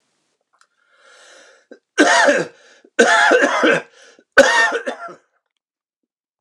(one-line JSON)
{"three_cough_length": "6.4 s", "three_cough_amplitude": 29204, "three_cough_signal_mean_std_ratio": 0.44, "survey_phase": "beta (2021-08-13 to 2022-03-07)", "age": "65+", "gender": "Male", "wearing_mask": "No", "symptom_cough_any": true, "symptom_runny_or_blocked_nose": true, "symptom_shortness_of_breath": true, "symptom_fatigue": true, "symptom_headache": true, "symptom_change_to_sense_of_smell_or_taste": true, "symptom_loss_of_taste": true, "smoker_status": "Ex-smoker", "respiratory_condition_asthma": false, "respiratory_condition_other": false, "recruitment_source": "Test and Trace", "submission_delay": "1 day", "covid_test_result": "Positive", "covid_test_method": "LFT"}